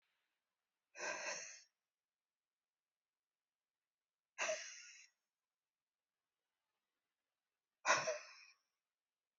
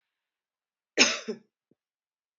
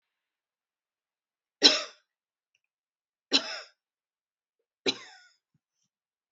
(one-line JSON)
{"exhalation_length": "9.4 s", "exhalation_amplitude": 3712, "exhalation_signal_mean_std_ratio": 0.25, "cough_length": "2.4 s", "cough_amplitude": 20770, "cough_signal_mean_std_ratio": 0.22, "three_cough_length": "6.3 s", "three_cough_amplitude": 21666, "three_cough_signal_mean_std_ratio": 0.18, "survey_phase": "beta (2021-08-13 to 2022-03-07)", "age": "45-64", "gender": "Female", "wearing_mask": "No", "symptom_none": true, "smoker_status": "Never smoked", "respiratory_condition_asthma": false, "respiratory_condition_other": false, "recruitment_source": "REACT", "submission_delay": "2 days", "covid_test_result": "Negative", "covid_test_method": "RT-qPCR", "influenza_a_test_result": "Negative", "influenza_b_test_result": "Negative"}